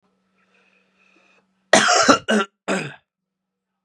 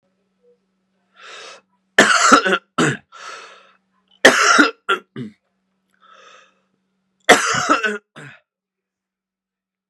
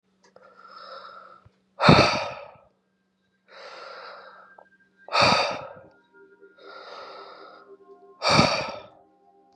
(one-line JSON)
{"cough_length": "3.8 s", "cough_amplitude": 32767, "cough_signal_mean_std_ratio": 0.35, "three_cough_length": "9.9 s", "three_cough_amplitude": 32768, "three_cough_signal_mean_std_ratio": 0.34, "exhalation_length": "9.6 s", "exhalation_amplitude": 30038, "exhalation_signal_mean_std_ratio": 0.33, "survey_phase": "beta (2021-08-13 to 2022-03-07)", "age": "18-44", "gender": "Male", "wearing_mask": "No", "symptom_cough_any": true, "symptom_runny_or_blocked_nose": true, "symptom_onset": "3 days", "smoker_status": "Never smoked", "respiratory_condition_asthma": false, "respiratory_condition_other": false, "recruitment_source": "Test and Trace", "submission_delay": "2 days", "covid_test_result": "Positive", "covid_test_method": "RT-qPCR", "covid_ct_value": 20.4, "covid_ct_gene": "ORF1ab gene", "covid_ct_mean": 20.4, "covid_viral_load": "210000 copies/ml", "covid_viral_load_category": "Low viral load (10K-1M copies/ml)"}